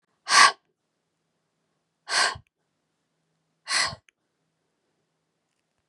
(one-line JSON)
{"exhalation_length": "5.9 s", "exhalation_amplitude": 27355, "exhalation_signal_mean_std_ratio": 0.24, "survey_phase": "beta (2021-08-13 to 2022-03-07)", "age": "18-44", "gender": "Female", "wearing_mask": "No", "symptom_headache": true, "symptom_onset": "12 days", "smoker_status": "Never smoked", "respiratory_condition_asthma": true, "respiratory_condition_other": false, "recruitment_source": "REACT", "submission_delay": "1 day", "covid_test_result": "Negative", "covid_test_method": "RT-qPCR", "influenza_a_test_result": "Negative", "influenza_b_test_result": "Negative"}